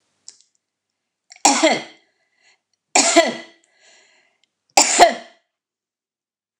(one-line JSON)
{"three_cough_length": "6.6 s", "three_cough_amplitude": 29204, "three_cough_signal_mean_std_ratio": 0.3, "survey_phase": "beta (2021-08-13 to 2022-03-07)", "age": "65+", "gender": "Female", "wearing_mask": "No", "symptom_runny_or_blocked_nose": true, "symptom_sore_throat": true, "symptom_abdominal_pain": true, "symptom_fatigue": true, "smoker_status": "Current smoker (e-cigarettes or vapes only)", "respiratory_condition_asthma": false, "respiratory_condition_other": false, "recruitment_source": "REACT", "submission_delay": "1 day", "covid_test_result": "Negative", "covid_test_method": "RT-qPCR", "influenza_a_test_result": "Negative", "influenza_b_test_result": "Negative"}